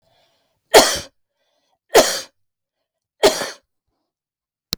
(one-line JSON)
{"three_cough_length": "4.8 s", "three_cough_amplitude": 32768, "three_cough_signal_mean_std_ratio": 0.27, "survey_phase": "beta (2021-08-13 to 2022-03-07)", "age": "45-64", "gender": "Female", "wearing_mask": "No", "symptom_headache": true, "symptom_onset": "9 days", "smoker_status": "Never smoked", "respiratory_condition_asthma": true, "respiratory_condition_other": false, "recruitment_source": "REACT", "submission_delay": "1 day", "covid_test_result": "Negative", "covid_test_method": "RT-qPCR", "influenza_a_test_result": "Negative", "influenza_b_test_result": "Negative"}